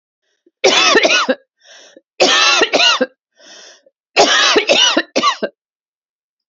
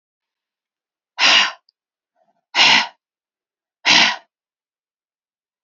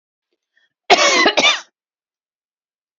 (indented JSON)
{
  "three_cough_length": "6.5 s",
  "three_cough_amplitude": 32768,
  "three_cough_signal_mean_std_ratio": 0.55,
  "exhalation_length": "5.6 s",
  "exhalation_amplitude": 32767,
  "exhalation_signal_mean_std_ratio": 0.32,
  "cough_length": "3.0 s",
  "cough_amplitude": 32498,
  "cough_signal_mean_std_ratio": 0.37,
  "survey_phase": "beta (2021-08-13 to 2022-03-07)",
  "age": "45-64",
  "gender": "Female",
  "wearing_mask": "No",
  "symptom_cough_any": true,
  "symptom_runny_or_blocked_nose": true,
  "symptom_change_to_sense_of_smell_or_taste": true,
  "smoker_status": "Never smoked",
  "respiratory_condition_asthma": false,
  "respiratory_condition_other": false,
  "recruitment_source": "Test and Trace",
  "submission_delay": "1 day",
  "covid_test_result": "Positive",
  "covid_test_method": "RT-qPCR",
  "covid_ct_value": 16.7,
  "covid_ct_gene": "ORF1ab gene",
  "covid_ct_mean": 17.0,
  "covid_viral_load": "2700000 copies/ml",
  "covid_viral_load_category": "High viral load (>1M copies/ml)"
}